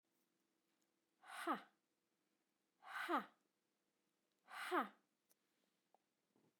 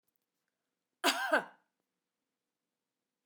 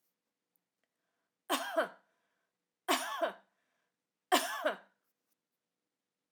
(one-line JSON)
{"exhalation_length": "6.6 s", "exhalation_amplitude": 1577, "exhalation_signal_mean_std_ratio": 0.28, "cough_length": "3.3 s", "cough_amplitude": 5674, "cough_signal_mean_std_ratio": 0.24, "three_cough_length": "6.3 s", "three_cough_amplitude": 7586, "three_cough_signal_mean_std_ratio": 0.31, "survey_phase": "alpha (2021-03-01 to 2021-08-12)", "age": "45-64", "gender": "Female", "wearing_mask": "No", "symptom_none": true, "smoker_status": "Never smoked", "respiratory_condition_asthma": false, "respiratory_condition_other": false, "recruitment_source": "REACT", "submission_delay": "3 days", "covid_test_result": "Negative", "covid_test_method": "RT-qPCR"}